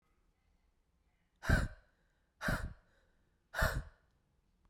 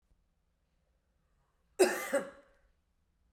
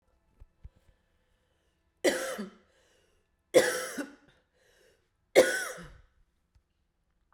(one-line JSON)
{"exhalation_length": "4.7 s", "exhalation_amplitude": 4337, "exhalation_signal_mean_std_ratio": 0.31, "cough_length": "3.3 s", "cough_amplitude": 7599, "cough_signal_mean_std_ratio": 0.25, "three_cough_length": "7.3 s", "three_cough_amplitude": 15584, "three_cough_signal_mean_std_ratio": 0.26, "survey_phase": "beta (2021-08-13 to 2022-03-07)", "age": "18-44", "gender": "Female", "wearing_mask": "No", "symptom_runny_or_blocked_nose": true, "symptom_sore_throat": true, "symptom_fatigue": true, "smoker_status": "Ex-smoker", "respiratory_condition_asthma": true, "respiratory_condition_other": false, "recruitment_source": "Test and Trace", "submission_delay": "2 days", "covid_test_result": "Positive", "covid_test_method": "LFT"}